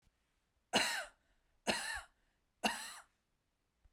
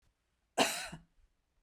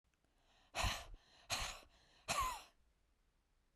{"three_cough_length": "3.9 s", "three_cough_amplitude": 4347, "three_cough_signal_mean_std_ratio": 0.36, "cough_length": "1.6 s", "cough_amplitude": 7166, "cough_signal_mean_std_ratio": 0.3, "exhalation_length": "3.8 s", "exhalation_amplitude": 1485, "exhalation_signal_mean_std_ratio": 0.42, "survey_phase": "beta (2021-08-13 to 2022-03-07)", "age": "45-64", "gender": "Female", "wearing_mask": "No", "symptom_none": true, "smoker_status": "Never smoked", "respiratory_condition_asthma": false, "respiratory_condition_other": false, "recruitment_source": "REACT", "submission_delay": "1 day", "covid_test_result": "Negative", "covid_test_method": "RT-qPCR", "influenza_a_test_result": "Negative", "influenza_b_test_result": "Negative"}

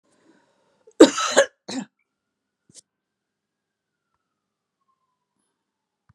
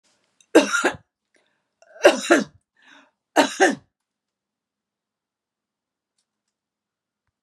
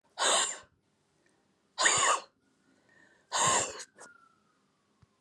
{"cough_length": "6.1 s", "cough_amplitude": 32768, "cough_signal_mean_std_ratio": 0.16, "three_cough_length": "7.4 s", "three_cough_amplitude": 32735, "three_cough_signal_mean_std_ratio": 0.25, "exhalation_length": "5.2 s", "exhalation_amplitude": 9170, "exhalation_signal_mean_std_ratio": 0.4, "survey_phase": "beta (2021-08-13 to 2022-03-07)", "age": "65+", "gender": "Female", "wearing_mask": "No", "symptom_none": true, "smoker_status": "Ex-smoker", "respiratory_condition_asthma": false, "respiratory_condition_other": false, "recruitment_source": "REACT", "submission_delay": "-1 day", "covid_test_result": "Negative", "covid_test_method": "RT-qPCR", "influenza_a_test_result": "Unknown/Void", "influenza_b_test_result": "Unknown/Void"}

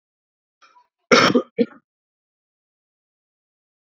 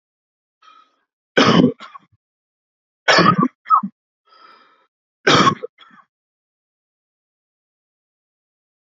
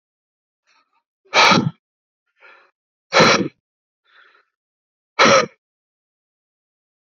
{"cough_length": "3.8 s", "cough_amplitude": 28542, "cough_signal_mean_std_ratio": 0.23, "three_cough_length": "9.0 s", "three_cough_amplitude": 32768, "three_cough_signal_mean_std_ratio": 0.29, "exhalation_length": "7.2 s", "exhalation_amplitude": 30989, "exhalation_signal_mean_std_ratio": 0.29, "survey_phase": "alpha (2021-03-01 to 2021-08-12)", "age": "18-44", "gender": "Male", "wearing_mask": "No", "symptom_cough_any": true, "symptom_fatigue": true, "symptom_fever_high_temperature": true, "symptom_headache": true, "symptom_onset": "2 days", "smoker_status": "Ex-smoker", "respiratory_condition_asthma": false, "respiratory_condition_other": false, "recruitment_source": "Test and Trace", "submission_delay": "2 days", "covid_test_result": "Positive", "covid_test_method": "RT-qPCR", "covid_ct_value": 22.2, "covid_ct_gene": "ORF1ab gene", "covid_ct_mean": 23.0, "covid_viral_load": "29000 copies/ml", "covid_viral_load_category": "Low viral load (10K-1M copies/ml)"}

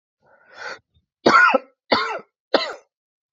{"three_cough_length": "3.3 s", "three_cough_amplitude": 26944, "three_cough_signal_mean_std_ratio": 0.36, "survey_phase": "alpha (2021-03-01 to 2021-08-12)", "age": "18-44", "gender": "Male", "wearing_mask": "No", "symptom_cough_any": true, "symptom_fatigue": true, "symptom_headache": true, "symptom_change_to_sense_of_smell_or_taste": true, "symptom_loss_of_taste": true, "smoker_status": "Never smoked", "respiratory_condition_asthma": false, "respiratory_condition_other": false, "recruitment_source": "Test and Trace", "submission_delay": "2 days", "covid_test_result": "Positive", "covid_test_method": "RT-qPCR", "covid_ct_value": 13.1, "covid_ct_gene": "ORF1ab gene", "covid_ct_mean": 13.4, "covid_viral_load": "39000000 copies/ml", "covid_viral_load_category": "High viral load (>1M copies/ml)"}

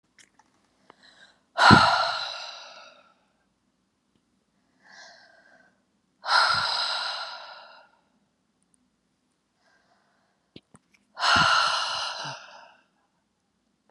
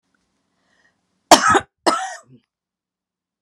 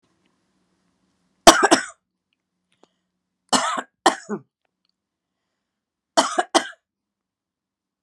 {"exhalation_length": "13.9 s", "exhalation_amplitude": 31737, "exhalation_signal_mean_std_ratio": 0.33, "cough_length": "3.4 s", "cough_amplitude": 32768, "cough_signal_mean_std_ratio": 0.26, "three_cough_length": "8.0 s", "three_cough_amplitude": 32768, "three_cough_signal_mean_std_ratio": 0.22, "survey_phase": "beta (2021-08-13 to 2022-03-07)", "age": "65+", "gender": "Female", "wearing_mask": "No", "symptom_none": true, "smoker_status": "Never smoked", "respiratory_condition_asthma": false, "respiratory_condition_other": false, "recruitment_source": "REACT", "submission_delay": "3 days", "covid_test_result": "Negative", "covid_test_method": "RT-qPCR"}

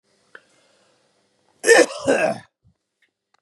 {"cough_length": "3.4 s", "cough_amplitude": 29672, "cough_signal_mean_std_ratio": 0.3, "survey_phase": "beta (2021-08-13 to 2022-03-07)", "age": "45-64", "gender": "Male", "wearing_mask": "No", "symptom_none": true, "smoker_status": "Ex-smoker", "respiratory_condition_asthma": false, "respiratory_condition_other": false, "recruitment_source": "REACT", "submission_delay": "9 days", "covid_test_result": "Negative", "covid_test_method": "RT-qPCR", "influenza_a_test_result": "Negative", "influenza_b_test_result": "Negative"}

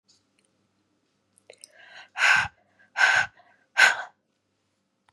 {"exhalation_length": "5.1 s", "exhalation_amplitude": 21033, "exhalation_signal_mean_std_ratio": 0.31, "survey_phase": "beta (2021-08-13 to 2022-03-07)", "age": "45-64", "gender": "Female", "wearing_mask": "No", "symptom_cough_any": true, "symptom_sore_throat": true, "symptom_abdominal_pain": true, "symptom_fatigue": true, "symptom_headache": true, "symptom_change_to_sense_of_smell_or_taste": true, "symptom_loss_of_taste": true, "symptom_onset": "2 days", "smoker_status": "Ex-smoker", "respiratory_condition_asthma": false, "respiratory_condition_other": false, "recruitment_source": "Test and Trace", "submission_delay": "2 days", "covid_test_result": "Positive", "covid_test_method": "RT-qPCR", "covid_ct_value": 17.3, "covid_ct_gene": "ORF1ab gene", "covid_ct_mean": 18.3, "covid_viral_load": "970000 copies/ml", "covid_viral_load_category": "Low viral load (10K-1M copies/ml)"}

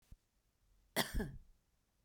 {"cough_length": "2.0 s", "cough_amplitude": 3573, "cough_signal_mean_std_ratio": 0.33, "survey_phase": "beta (2021-08-13 to 2022-03-07)", "age": "45-64", "gender": "Female", "wearing_mask": "No", "symptom_none": true, "smoker_status": "Ex-smoker", "respiratory_condition_asthma": false, "respiratory_condition_other": false, "recruitment_source": "REACT", "submission_delay": "1 day", "covid_test_result": "Negative", "covid_test_method": "RT-qPCR"}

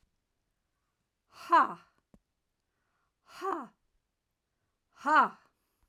{"exhalation_length": "5.9 s", "exhalation_amplitude": 8795, "exhalation_signal_mean_std_ratio": 0.24, "survey_phase": "alpha (2021-03-01 to 2021-08-12)", "age": "45-64", "gender": "Female", "wearing_mask": "No", "symptom_none": true, "smoker_status": "Ex-smoker", "respiratory_condition_asthma": false, "respiratory_condition_other": false, "recruitment_source": "REACT", "submission_delay": "2 days", "covid_test_result": "Negative", "covid_test_method": "RT-qPCR"}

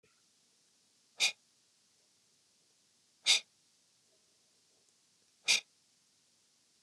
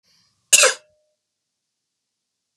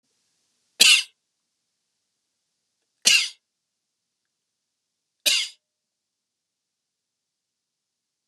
{"exhalation_length": "6.8 s", "exhalation_amplitude": 7367, "exhalation_signal_mean_std_ratio": 0.19, "cough_length": "2.6 s", "cough_amplitude": 32768, "cough_signal_mean_std_ratio": 0.21, "three_cough_length": "8.3 s", "three_cough_amplitude": 32768, "three_cough_signal_mean_std_ratio": 0.2, "survey_phase": "beta (2021-08-13 to 2022-03-07)", "age": "45-64", "gender": "Male", "wearing_mask": "No", "symptom_none": true, "smoker_status": "Ex-smoker", "respiratory_condition_asthma": false, "respiratory_condition_other": false, "recruitment_source": "REACT", "submission_delay": "2 days", "covid_test_result": "Negative", "covid_test_method": "RT-qPCR"}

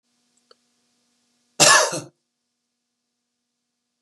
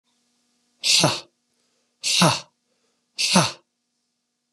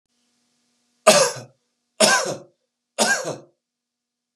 {"cough_length": "4.0 s", "cough_amplitude": 32456, "cough_signal_mean_std_ratio": 0.23, "exhalation_length": "4.5 s", "exhalation_amplitude": 31372, "exhalation_signal_mean_std_ratio": 0.36, "three_cough_length": "4.4 s", "three_cough_amplitude": 32740, "three_cough_signal_mean_std_ratio": 0.34, "survey_phase": "beta (2021-08-13 to 2022-03-07)", "age": "45-64", "gender": "Male", "wearing_mask": "No", "symptom_runny_or_blocked_nose": true, "symptom_headache": true, "symptom_change_to_sense_of_smell_or_taste": true, "smoker_status": "Ex-smoker", "respiratory_condition_asthma": false, "respiratory_condition_other": false, "recruitment_source": "Test and Trace", "submission_delay": "1 day", "covid_test_result": "Positive", "covid_test_method": "RT-qPCR", "covid_ct_value": 14.8, "covid_ct_gene": "ORF1ab gene", "covid_ct_mean": 15.0, "covid_viral_load": "12000000 copies/ml", "covid_viral_load_category": "High viral load (>1M copies/ml)"}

